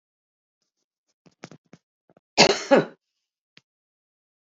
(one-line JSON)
{"cough_length": "4.5 s", "cough_amplitude": 28411, "cough_signal_mean_std_ratio": 0.2, "survey_phase": "beta (2021-08-13 to 2022-03-07)", "age": "65+", "gender": "Female", "wearing_mask": "No", "symptom_none": true, "smoker_status": "Ex-smoker", "respiratory_condition_asthma": false, "respiratory_condition_other": false, "recruitment_source": "REACT", "submission_delay": "1 day", "covid_test_result": "Negative", "covid_test_method": "RT-qPCR"}